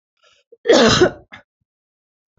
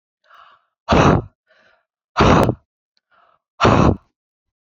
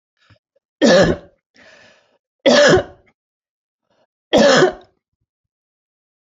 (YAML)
cough_length: 2.4 s
cough_amplitude: 29321
cough_signal_mean_std_ratio: 0.35
exhalation_length: 4.8 s
exhalation_amplitude: 29052
exhalation_signal_mean_std_ratio: 0.38
three_cough_length: 6.2 s
three_cough_amplitude: 29280
three_cough_signal_mean_std_ratio: 0.36
survey_phase: beta (2021-08-13 to 2022-03-07)
age: 45-64
gender: Female
wearing_mask: 'No'
symptom_none: true
smoker_status: Never smoked
respiratory_condition_asthma: false
respiratory_condition_other: false
recruitment_source: REACT
submission_delay: 2 days
covid_test_result: Negative
covid_test_method: RT-qPCR
influenza_a_test_result: Negative
influenza_b_test_result: Negative